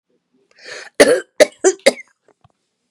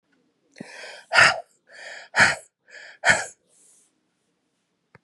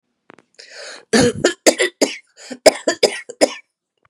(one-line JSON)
{"cough_length": "2.9 s", "cough_amplitude": 32768, "cough_signal_mean_std_ratio": 0.29, "exhalation_length": "5.0 s", "exhalation_amplitude": 29986, "exhalation_signal_mean_std_ratio": 0.29, "three_cough_length": "4.1 s", "three_cough_amplitude": 32768, "three_cough_signal_mean_std_ratio": 0.37, "survey_phase": "beta (2021-08-13 to 2022-03-07)", "age": "45-64", "gender": "Female", "wearing_mask": "No", "symptom_fatigue": true, "symptom_headache": true, "symptom_onset": "6 days", "smoker_status": "Current smoker (e-cigarettes or vapes only)", "respiratory_condition_asthma": false, "respiratory_condition_other": false, "recruitment_source": "REACT", "submission_delay": "1 day", "covid_test_result": "Negative", "covid_test_method": "RT-qPCR", "influenza_a_test_result": "Unknown/Void", "influenza_b_test_result": "Unknown/Void"}